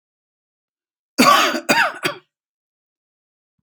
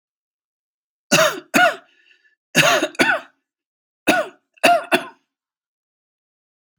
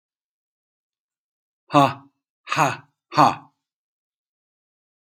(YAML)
cough_length: 3.6 s
cough_amplitude: 32768
cough_signal_mean_std_ratio: 0.35
three_cough_length: 6.8 s
three_cough_amplitude: 32589
three_cough_signal_mean_std_ratio: 0.36
exhalation_length: 5.0 s
exhalation_amplitude: 27573
exhalation_signal_mean_std_ratio: 0.24
survey_phase: alpha (2021-03-01 to 2021-08-12)
age: 45-64
gender: Male
wearing_mask: 'No'
symptom_none: true
smoker_status: Never smoked
respiratory_condition_asthma: false
respiratory_condition_other: false
recruitment_source: REACT
submission_delay: 4 days
covid_test_result: Negative
covid_test_method: RT-qPCR